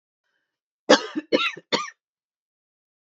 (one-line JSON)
{"cough_length": "3.1 s", "cough_amplitude": 26939, "cough_signal_mean_std_ratio": 0.27, "survey_phase": "beta (2021-08-13 to 2022-03-07)", "age": "18-44", "gender": "Female", "wearing_mask": "No", "symptom_cough_any": true, "symptom_runny_or_blocked_nose": true, "symptom_fatigue": true, "symptom_headache": true, "symptom_onset": "5 days", "smoker_status": "Never smoked", "respiratory_condition_asthma": false, "respiratory_condition_other": false, "recruitment_source": "REACT", "submission_delay": "3 days", "covid_test_result": "Negative", "covid_test_method": "RT-qPCR", "influenza_a_test_result": "Unknown/Void", "influenza_b_test_result": "Unknown/Void"}